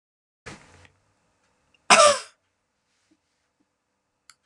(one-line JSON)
{"cough_length": "4.5 s", "cough_amplitude": 32064, "cough_signal_mean_std_ratio": 0.2, "survey_phase": "beta (2021-08-13 to 2022-03-07)", "age": "65+", "gender": "Female", "wearing_mask": "No", "symptom_none": true, "smoker_status": "Never smoked", "respiratory_condition_asthma": false, "respiratory_condition_other": false, "recruitment_source": "REACT", "submission_delay": "1 day", "covid_test_result": "Negative", "covid_test_method": "RT-qPCR"}